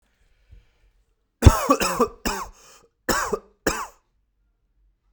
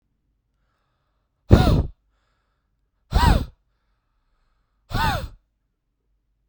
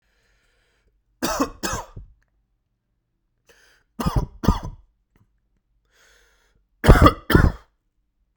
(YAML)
cough_length: 5.1 s
cough_amplitude: 32768
cough_signal_mean_std_ratio: 0.3
exhalation_length: 6.5 s
exhalation_amplitude: 32767
exhalation_signal_mean_std_ratio: 0.28
three_cough_length: 8.4 s
three_cough_amplitude: 32768
three_cough_signal_mean_std_ratio: 0.26
survey_phase: beta (2021-08-13 to 2022-03-07)
age: 18-44
gender: Male
wearing_mask: 'No'
symptom_new_continuous_cough: true
symptom_runny_or_blocked_nose: true
symptom_sore_throat: true
symptom_fatigue: true
symptom_onset: 2 days
smoker_status: Never smoked
respiratory_condition_asthma: true
respiratory_condition_other: false
recruitment_source: Test and Trace
submission_delay: 1 day
covid_test_result: Positive
covid_test_method: RT-qPCR
covid_ct_value: 23.5
covid_ct_gene: N gene